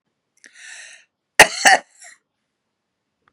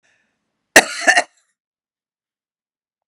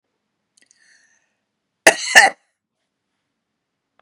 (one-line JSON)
{"three_cough_length": "3.3 s", "three_cough_amplitude": 32768, "three_cough_signal_mean_std_ratio": 0.21, "exhalation_length": "3.1 s", "exhalation_amplitude": 32768, "exhalation_signal_mean_std_ratio": 0.21, "cough_length": "4.0 s", "cough_amplitude": 32768, "cough_signal_mean_std_ratio": 0.19, "survey_phase": "beta (2021-08-13 to 2022-03-07)", "age": "65+", "gender": "Female", "wearing_mask": "No", "symptom_none": true, "smoker_status": "Never smoked", "respiratory_condition_asthma": false, "respiratory_condition_other": false, "recruitment_source": "REACT", "submission_delay": "2 days", "covid_test_result": "Negative", "covid_test_method": "RT-qPCR", "influenza_a_test_result": "Negative", "influenza_b_test_result": "Negative"}